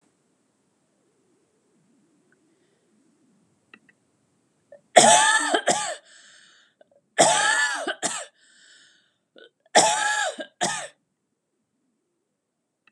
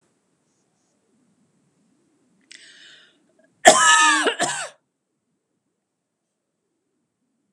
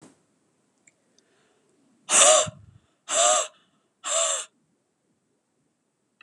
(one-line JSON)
{"three_cough_length": "12.9 s", "three_cough_amplitude": 32718, "three_cough_signal_mean_std_ratio": 0.33, "cough_length": "7.5 s", "cough_amplitude": 32768, "cough_signal_mean_std_ratio": 0.25, "exhalation_length": "6.2 s", "exhalation_amplitude": 24536, "exhalation_signal_mean_std_ratio": 0.32, "survey_phase": "beta (2021-08-13 to 2022-03-07)", "age": "45-64", "gender": "Female", "wearing_mask": "No", "symptom_cough_any": true, "smoker_status": "Ex-smoker", "respiratory_condition_asthma": false, "respiratory_condition_other": false, "recruitment_source": "REACT", "submission_delay": "1 day", "covid_test_result": "Negative", "covid_test_method": "RT-qPCR", "influenza_a_test_result": "Negative", "influenza_b_test_result": "Negative"}